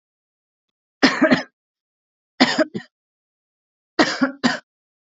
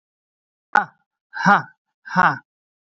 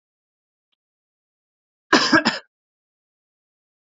{
  "three_cough_length": "5.1 s",
  "three_cough_amplitude": 32767,
  "three_cough_signal_mean_std_ratio": 0.32,
  "exhalation_length": "3.0 s",
  "exhalation_amplitude": 29583,
  "exhalation_signal_mean_std_ratio": 0.3,
  "cough_length": "3.8 s",
  "cough_amplitude": 26366,
  "cough_signal_mean_std_ratio": 0.23,
  "survey_phase": "alpha (2021-03-01 to 2021-08-12)",
  "age": "18-44",
  "gender": "Male",
  "wearing_mask": "No",
  "symptom_none": true,
  "smoker_status": "Never smoked",
  "respiratory_condition_asthma": false,
  "respiratory_condition_other": false,
  "recruitment_source": "REACT",
  "submission_delay": "2 days",
  "covid_test_result": "Negative",
  "covid_test_method": "RT-qPCR"
}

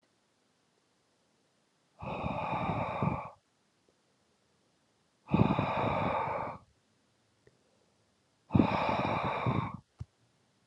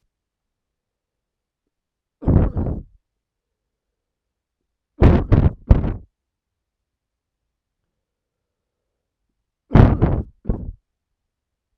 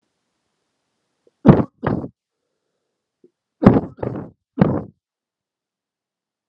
{
  "exhalation_length": "10.7 s",
  "exhalation_amplitude": 9717,
  "exhalation_signal_mean_std_ratio": 0.46,
  "three_cough_length": "11.8 s",
  "three_cough_amplitude": 32768,
  "three_cough_signal_mean_std_ratio": 0.27,
  "cough_length": "6.5 s",
  "cough_amplitude": 32768,
  "cough_signal_mean_std_ratio": 0.24,
  "survey_phase": "alpha (2021-03-01 to 2021-08-12)",
  "age": "18-44",
  "gender": "Male",
  "wearing_mask": "No",
  "symptom_cough_any": true,
  "symptom_fatigue": true,
  "symptom_fever_high_temperature": true,
  "symptom_headache": true,
  "symptom_change_to_sense_of_smell_or_taste": true,
  "symptom_loss_of_taste": true,
  "symptom_onset": "5 days",
  "smoker_status": "Never smoked",
  "respiratory_condition_asthma": false,
  "respiratory_condition_other": false,
  "recruitment_source": "Test and Trace",
  "submission_delay": "2 days",
  "covid_test_result": "Positive",
  "covid_test_method": "RT-qPCR",
  "covid_ct_value": 15.2,
  "covid_ct_gene": "ORF1ab gene",
  "covid_ct_mean": 15.3,
  "covid_viral_load": "9400000 copies/ml",
  "covid_viral_load_category": "High viral load (>1M copies/ml)"
}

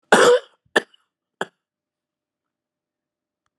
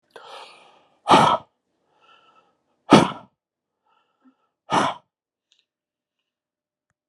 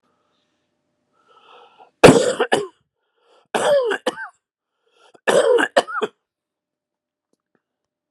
{
  "cough_length": "3.6 s",
  "cough_amplitude": 32768,
  "cough_signal_mean_std_ratio": 0.24,
  "exhalation_length": "7.1 s",
  "exhalation_amplitude": 32767,
  "exhalation_signal_mean_std_ratio": 0.24,
  "three_cough_length": "8.1 s",
  "three_cough_amplitude": 32768,
  "three_cough_signal_mean_std_ratio": 0.32,
  "survey_phase": "beta (2021-08-13 to 2022-03-07)",
  "age": "65+",
  "gender": "Male",
  "wearing_mask": "No",
  "symptom_cough_any": true,
  "symptom_runny_or_blocked_nose": true,
  "symptom_fatigue": true,
  "symptom_headache": true,
  "smoker_status": "Never smoked",
  "respiratory_condition_asthma": false,
  "respiratory_condition_other": false,
  "recruitment_source": "Test and Trace",
  "submission_delay": "1 day",
  "covid_test_result": "Positive",
  "covid_test_method": "RT-qPCR"
}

